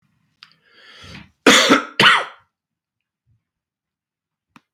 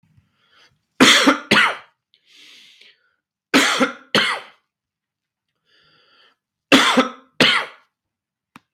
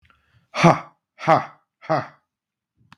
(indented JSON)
{
  "cough_length": "4.7 s",
  "cough_amplitude": 32768,
  "cough_signal_mean_std_ratio": 0.29,
  "three_cough_length": "8.7 s",
  "three_cough_amplitude": 32768,
  "three_cough_signal_mean_std_ratio": 0.36,
  "exhalation_length": "3.0 s",
  "exhalation_amplitude": 32768,
  "exhalation_signal_mean_std_ratio": 0.3,
  "survey_phase": "beta (2021-08-13 to 2022-03-07)",
  "age": "45-64",
  "gender": "Male",
  "wearing_mask": "Yes",
  "symptom_cough_any": true,
  "symptom_shortness_of_breath": true,
  "symptom_sore_throat": true,
  "symptom_fatigue": true,
  "symptom_headache": true,
  "symptom_onset": "3 days",
  "smoker_status": "Ex-smoker",
  "respiratory_condition_asthma": false,
  "respiratory_condition_other": false,
  "recruitment_source": "Test and Trace",
  "submission_delay": "2 days",
  "covid_test_result": "Positive",
  "covid_test_method": "ePCR"
}